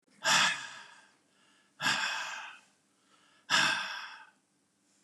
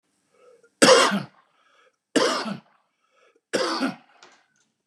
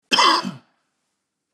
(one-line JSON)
{"exhalation_length": "5.0 s", "exhalation_amplitude": 8517, "exhalation_signal_mean_std_ratio": 0.44, "three_cough_length": "4.9 s", "three_cough_amplitude": 30778, "three_cough_signal_mean_std_ratio": 0.35, "cough_length": "1.5 s", "cough_amplitude": 24001, "cough_signal_mean_std_ratio": 0.39, "survey_phase": "beta (2021-08-13 to 2022-03-07)", "age": "65+", "gender": "Male", "wearing_mask": "No", "symptom_cough_any": true, "smoker_status": "Ex-smoker", "respiratory_condition_asthma": false, "respiratory_condition_other": false, "recruitment_source": "REACT", "submission_delay": "2 days", "covid_test_result": "Negative", "covid_test_method": "RT-qPCR", "influenza_a_test_result": "Negative", "influenza_b_test_result": "Negative"}